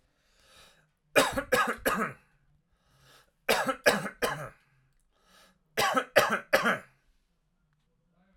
{"three_cough_length": "8.4 s", "three_cough_amplitude": 16731, "three_cough_signal_mean_std_ratio": 0.38, "survey_phase": "alpha (2021-03-01 to 2021-08-12)", "age": "45-64", "gender": "Male", "wearing_mask": "No", "symptom_none": true, "smoker_status": "Ex-smoker", "respiratory_condition_asthma": false, "respiratory_condition_other": false, "recruitment_source": "REACT", "submission_delay": "3 days", "covid_test_result": "Negative", "covid_test_method": "RT-qPCR"}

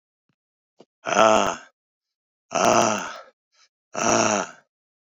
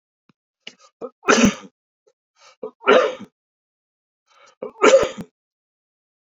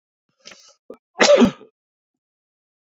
{"exhalation_length": "5.1 s", "exhalation_amplitude": 29615, "exhalation_signal_mean_std_ratio": 0.41, "three_cough_length": "6.3 s", "three_cough_amplitude": 28502, "three_cough_signal_mean_std_ratio": 0.29, "cough_length": "2.8 s", "cough_amplitude": 29331, "cough_signal_mean_std_ratio": 0.28, "survey_phase": "beta (2021-08-13 to 2022-03-07)", "age": "45-64", "gender": "Male", "wearing_mask": "No", "symptom_cough_any": true, "symptom_new_continuous_cough": true, "symptom_runny_or_blocked_nose": true, "symptom_shortness_of_breath": true, "symptom_sore_throat": true, "symptom_fatigue": true, "symptom_headache": true, "symptom_change_to_sense_of_smell_or_taste": true, "symptom_loss_of_taste": true, "symptom_onset": "3 days", "smoker_status": "Never smoked", "respiratory_condition_asthma": false, "respiratory_condition_other": false, "recruitment_source": "Test and Trace", "submission_delay": "2 days", "covid_test_result": "Positive", "covid_test_method": "RT-qPCR", "covid_ct_value": 21.6, "covid_ct_gene": "ORF1ab gene", "covid_ct_mean": 21.9, "covid_viral_load": "68000 copies/ml", "covid_viral_load_category": "Low viral load (10K-1M copies/ml)"}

